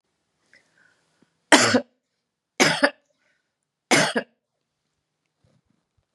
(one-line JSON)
{"three_cough_length": "6.1 s", "three_cough_amplitude": 32732, "three_cough_signal_mean_std_ratio": 0.27, "survey_phase": "beta (2021-08-13 to 2022-03-07)", "age": "65+", "gender": "Female", "wearing_mask": "No", "symptom_cough_any": true, "symptom_runny_or_blocked_nose": true, "symptom_sore_throat": true, "symptom_fatigue": true, "symptom_onset": "3 days", "smoker_status": "Never smoked", "respiratory_condition_asthma": false, "respiratory_condition_other": false, "recruitment_source": "Test and Trace", "submission_delay": "1 day", "covid_test_result": "Positive", "covid_test_method": "ePCR"}